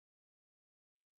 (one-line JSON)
{"exhalation_length": "1.2 s", "exhalation_amplitude": 1, "exhalation_signal_mean_std_ratio": 0.05, "survey_phase": "beta (2021-08-13 to 2022-03-07)", "age": "45-64", "gender": "Male", "wearing_mask": "No", "symptom_cough_any": true, "symptom_runny_or_blocked_nose": true, "smoker_status": "Current smoker (11 or more cigarettes per day)", "respiratory_condition_asthma": false, "respiratory_condition_other": false, "recruitment_source": "REACT", "submission_delay": "3 days", "covid_test_result": "Negative", "covid_test_method": "RT-qPCR"}